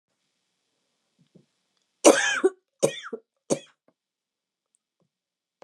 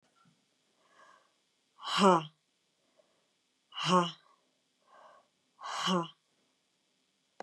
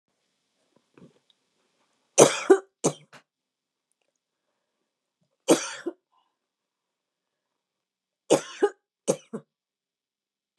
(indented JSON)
{
  "cough_length": "5.6 s",
  "cough_amplitude": 28022,
  "cough_signal_mean_std_ratio": 0.22,
  "exhalation_length": "7.4 s",
  "exhalation_amplitude": 9200,
  "exhalation_signal_mean_std_ratio": 0.27,
  "three_cough_length": "10.6 s",
  "three_cough_amplitude": 30849,
  "three_cough_signal_mean_std_ratio": 0.19,
  "survey_phase": "beta (2021-08-13 to 2022-03-07)",
  "age": "45-64",
  "gender": "Female",
  "wearing_mask": "No",
  "symptom_cough_any": true,
  "symptom_runny_or_blocked_nose": true,
  "symptom_fatigue": true,
  "smoker_status": "Never smoked",
  "respiratory_condition_asthma": false,
  "respiratory_condition_other": true,
  "recruitment_source": "Test and Trace",
  "submission_delay": "1 day",
  "covid_test_result": "Negative",
  "covid_test_method": "RT-qPCR"
}